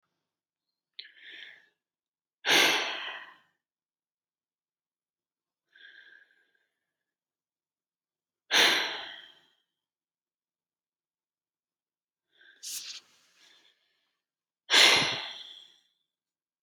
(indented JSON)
{
  "exhalation_length": "16.6 s",
  "exhalation_amplitude": 15921,
  "exhalation_signal_mean_std_ratio": 0.25,
  "survey_phase": "beta (2021-08-13 to 2022-03-07)",
  "age": "45-64",
  "gender": "Female",
  "wearing_mask": "No",
  "symptom_runny_or_blocked_nose": true,
  "smoker_status": "Never smoked",
  "respiratory_condition_asthma": false,
  "respiratory_condition_other": false,
  "recruitment_source": "REACT",
  "submission_delay": "1 day",
  "covid_test_result": "Negative",
  "covid_test_method": "RT-qPCR",
  "influenza_a_test_result": "Negative",
  "influenza_b_test_result": "Negative"
}